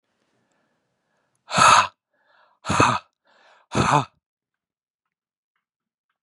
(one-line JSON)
{"exhalation_length": "6.2 s", "exhalation_amplitude": 28159, "exhalation_signal_mean_std_ratio": 0.29, "survey_phase": "beta (2021-08-13 to 2022-03-07)", "age": "45-64", "gender": "Male", "wearing_mask": "No", "symptom_new_continuous_cough": true, "symptom_runny_or_blocked_nose": true, "symptom_sore_throat": true, "symptom_change_to_sense_of_smell_or_taste": true, "symptom_onset": "12 days", "smoker_status": "Never smoked", "respiratory_condition_asthma": false, "respiratory_condition_other": false, "recruitment_source": "REACT", "submission_delay": "1 day", "covid_test_result": "Negative", "covid_test_method": "RT-qPCR", "influenza_a_test_result": "Negative", "influenza_b_test_result": "Negative"}